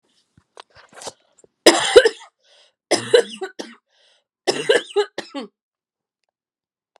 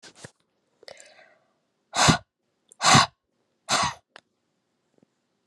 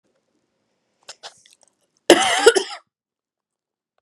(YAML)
three_cough_length: 7.0 s
three_cough_amplitude: 32768
three_cough_signal_mean_std_ratio: 0.28
exhalation_length: 5.5 s
exhalation_amplitude: 22366
exhalation_signal_mean_std_ratio: 0.27
cough_length: 4.0 s
cough_amplitude: 32768
cough_signal_mean_std_ratio: 0.25
survey_phase: beta (2021-08-13 to 2022-03-07)
age: 18-44
gender: Female
wearing_mask: 'No'
symptom_none: true
smoker_status: Never smoked
respiratory_condition_asthma: false
respiratory_condition_other: false
recruitment_source: REACT
submission_delay: 3 days
covid_test_result: Negative
covid_test_method: RT-qPCR